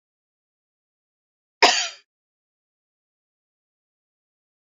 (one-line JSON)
{"cough_length": "4.7 s", "cough_amplitude": 31036, "cough_signal_mean_std_ratio": 0.16, "survey_phase": "alpha (2021-03-01 to 2021-08-12)", "age": "65+", "gender": "Female", "wearing_mask": "No", "symptom_shortness_of_breath": true, "symptom_fatigue": true, "symptom_change_to_sense_of_smell_or_taste": true, "symptom_onset": "12 days", "smoker_status": "Never smoked", "respiratory_condition_asthma": true, "respiratory_condition_other": false, "recruitment_source": "REACT", "submission_delay": "1 day", "covid_test_result": "Negative", "covid_test_method": "RT-qPCR"}